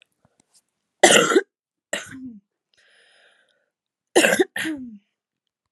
{"cough_length": "5.7 s", "cough_amplitude": 32768, "cough_signal_mean_std_ratio": 0.3, "survey_phase": "alpha (2021-03-01 to 2021-08-12)", "age": "18-44", "gender": "Female", "wearing_mask": "No", "symptom_cough_any": true, "symptom_new_continuous_cough": true, "symptom_shortness_of_breath": true, "symptom_abdominal_pain": true, "symptom_diarrhoea": true, "symptom_fatigue": true, "symptom_headache": true, "symptom_onset": "5 days", "smoker_status": "Never smoked", "respiratory_condition_asthma": false, "respiratory_condition_other": false, "recruitment_source": "Test and Trace", "submission_delay": "3 days", "covid_test_result": "Positive", "covid_test_method": "ePCR"}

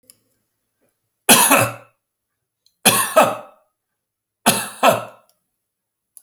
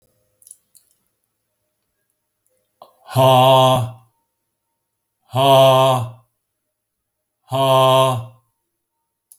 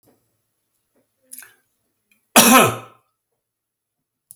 {"three_cough_length": "6.2 s", "three_cough_amplitude": 32768, "three_cough_signal_mean_std_ratio": 0.34, "exhalation_length": "9.4 s", "exhalation_amplitude": 27263, "exhalation_signal_mean_std_ratio": 0.41, "cough_length": "4.4 s", "cough_amplitude": 32768, "cough_signal_mean_std_ratio": 0.24, "survey_phase": "beta (2021-08-13 to 2022-03-07)", "age": "65+", "gender": "Male", "wearing_mask": "No", "symptom_none": true, "smoker_status": "Never smoked", "respiratory_condition_asthma": false, "respiratory_condition_other": false, "recruitment_source": "REACT", "submission_delay": "1 day", "covid_test_result": "Negative", "covid_test_method": "RT-qPCR"}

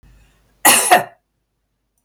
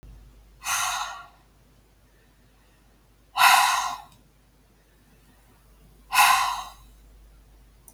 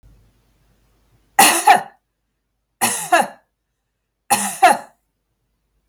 {"cough_length": "2.0 s", "cough_amplitude": 32768, "cough_signal_mean_std_ratio": 0.34, "exhalation_length": "7.9 s", "exhalation_amplitude": 21640, "exhalation_signal_mean_std_ratio": 0.35, "three_cough_length": "5.9 s", "three_cough_amplitude": 32768, "three_cough_signal_mean_std_ratio": 0.32, "survey_phase": "beta (2021-08-13 to 2022-03-07)", "age": "65+", "gender": "Female", "wearing_mask": "No", "symptom_runny_or_blocked_nose": true, "symptom_sore_throat": true, "smoker_status": "Never smoked", "respiratory_condition_asthma": false, "respiratory_condition_other": false, "recruitment_source": "Test and Trace", "submission_delay": "1 day", "covid_test_result": "Positive", "covid_test_method": "LFT"}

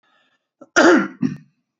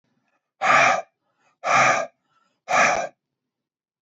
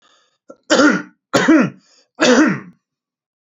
{"cough_length": "1.8 s", "cough_amplitude": 28067, "cough_signal_mean_std_ratio": 0.38, "exhalation_length": "4.0 s", "exhalation_amplitude": 18655, "exhalation_signal_mean_std_ratio": 0.45, "three_cough_length": "3.5 s", "three_cough_amplitude": 32767, "three_cough_signal_mean_std_ratio": 0.46, "survey_phase": "beta (2021-08-13 to 2022-03-07)", "age": "45-64", "gender": "Male", "wearing_mask": "Yes", "symptom_cough_any": true, "symptom_onset": "3 days", "smoker_status": "Ex-smoker", "respiratory_condition_asthma": false, "respiratory_condition_other": false, "recruitment_source": "Test and Trace", "submission_delay": "2 days", "covid_test_result": "Positive", "covid_test_method": "RT-qPCR", "covid_ct_value": 28.6, "covid_ct_gene": "N gene"}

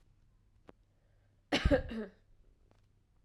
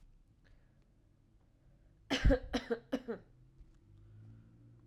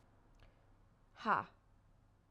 {"cough_length": "3.2 s", "cough_amplitude": 6169, "cough_signal_mean_std_ratio": 0.28, "three_cough_length": "4.9 s", "three_cough_amplitude": 4814, "three_cough_signal_mean_std_ratio": 0.29, "exhalation_length": "2.3 s", "exhalation_amplitude": 3160, "exhalation_signal_mean_std_ratio": 0.26, "survey_phase": "alpha (2021-03-01 to 2021-08-12)", "age": "18-44", "gender": "Female", "wearing_mask": "No", "symptom_fatigue": true, "symptom_headache": true, "smoker_status": "Never smoked", "respiratory_condition_asthma": false, "respiratory_condition_other": false, "recruitment_source": "Test and Trace", "submission_delay": "1 day", "covid_test_result": "Positive", "covid_test_method": "RT-qPCR", "covid_ct_value": 14.9, "covid_ct_gene": "ORF1ab gene", "covid_ct_mean": 15.3, "covid_viral_load": "9500000 copies/ml", "covid_viral_load_category": "High viral load (>1M copies/ml)"}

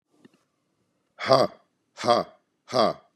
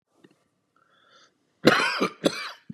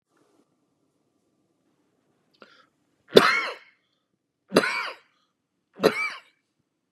{"exhalation_length": "3.2 s", "exhalation_amplitude": 26833, "exhalation_signal_mean_std_ratio": 0.33, "cough_length": "2.7 s", "cough_amplitude": 26335, "cough_signal_mean_std_ratio": 0.33, "three_cough_length": "6.9 s", "three_cough_amplitude": 32768, "three_cough_signal_mean_std_ratio": 0.23, "survey_phase": "beta (2021-08-13 to 2022-03-07)", "age": "45-64", "gender": "Male", "wearing_mask": "No", "symptom_cough_any": true, "symptom_runny_or_blocked_nose": true, "symptom_sore_throat": true, "symptom_fatigue": true, "symptom_onset": "2 days", "smoker_status": "Ex-smoker", "respiratory_condition_asthma": false, "respiratory_condition_other": false, "recruitment_source": "Test and Trace", "submission_delay": "1 day", "covid_test_result": "Negative", "covid_test_method": "ePCR"}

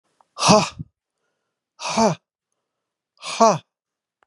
{"exhalation_length": "4.3 s", "exhalation_amplitude": 32067, "exhalation_signal_mean_std_ratio": 0.32, "survey_phase": "beta (2021-08-13 to 2022-03-07)", "age": "65+", "gender": "Male", "wearing_mask": "No", "symptom_none": true, "smoker_status": "Ex-smoker", "respiratory_condition_asthma": false, "respiratory_condition_other": false, "recruitment_source": "REACT", "submission_delay": "0 days", "covid_test_result": "Negative", "covid_test_method": "RT-qPCR"}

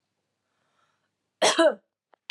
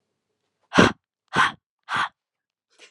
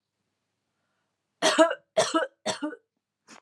{"cough_length": "2.3 s", "cough_amplitude": 13879, "cough_signal_mean_std_ratio": 0.29, "exhalation_length": "2.9 s", "exhalation_amplitude": 32184, "exhalation_signal_mean_std_ratio": 0.3, "three_cough_length": "3.4 s", "three_cough_amplitude": 17415, "three_cough_signal_mean_std_ratio": 0.34, "survey_phase": "beta (2021-08-13 to 2022-03-07)", "age": "18-44", "gender": "Female", "wearing_mask": "No", "symptom_none": true, "symptom_onset": "12 days", "smoker_status": "Never smoked", "respiratory_condition_asthma": true, "respiratory_condition_other": false, "recruitment_source": "REACT", "submission_delay": "2 days", "covid_test_result": "Negative", "covid_test_method": "RT-qPCR"}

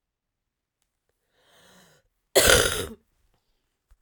{"cough_length": "4.0 s", "cough_amplitude": 32767, "cough_signal_mean_std_ratio": 0.25, "survey_phase": "beta (2021-08-13 to 2022-03-07)", "age": "45-64", "gender": "Female", "wearing_mask": "No", "symptom_cough_any": true, "symptom_runny_or_blocked_nose": true, "symptom_sore_throat": true, "symptom_onset": "4 days", "smoker_status": "Ex-smoker", "respiratory_condition_asthma": false, "respiratory_condition_other": false, "recruitment_source": "Test and Trace", "submission_delay": "1 day", "covid_test_result": "Positive", "covid_test_method": "RT-qPCR", "covid_ct_value": 21.4, "covid_ct_gene": "N gene"}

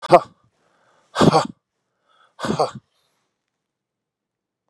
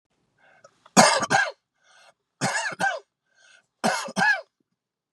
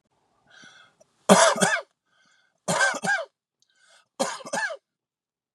{"exhalation_length": "4.7 s", "exhalation_amplitude": 32768, "exhalation_signal_mean_std_ratio": 0.25, "cough_length": "5.1 s", "cough_amplitude": 32368, "cough_signal_mean_std_ratio": 0.39, "three_cough_length": "5.5 s", "three_cough_amplitude": 32406, "three_cough_signal_mean_std_ratio": 0.36, "survey_phase": "beta (2021-08-13 to 2022-03-07)", "age": "45-64", "gender": "Male", "wearing_mask": "No", "symptom_cough_any": true, "smoker_status": "Current smoker (11 or more cigarettes per day)", "respiratory_condition_asthma": false, "respiratory_condition_other": false, "recruitment_source": "REACT", "submission_delay": "2 days", "covid_test_result": "Negative", "covid_test_method": "RT-qPCR"}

